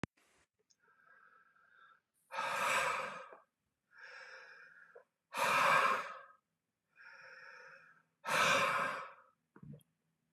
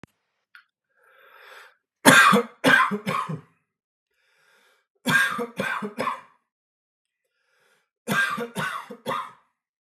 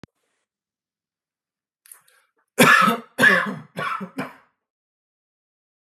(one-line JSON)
{"exhalation_length": "10.3 s", "exhalation_amplitude": 4359, "exhalation_signal_mean_std_ratio": 0.42, "three_cough_length": "9.8 s", "three_cough_amplitude": 32694, "three_cough_signal_mean_std_ratio": 0.36, "cough_length": "6.0 s", "cough_amplitude": 30726, "cough_signal_mean_std_ratio": 0.31, "survey_phase": "beta (2021-08-13 to 2022-03-07)", "age": "45-64", "gender": "Male", "wearing_mask": "No", "symptom_cough_any": true, "symptom_new_continuous_cough": true, "symptom_runny_or_blocked_nose": true, "symptom_fatigue": true, "smoker_status": "Ex-smoker", "respiratory_condition_asthma": false, "respiratory_condition_other": false, "recruitment_source": "Test and Trace", "submission_delay": "2 days", "covid_test_result": "Positive", "covid_test_method": "RT-qPCR", "covid_ct_value": 16.7, "covid_ct_gene": "N gene", "covid_ct_mean": 17.0, "covid_viral_load": "2600000 copies/ml", "covid_viral_load_category": "High viral load (>1M copies/ml)"}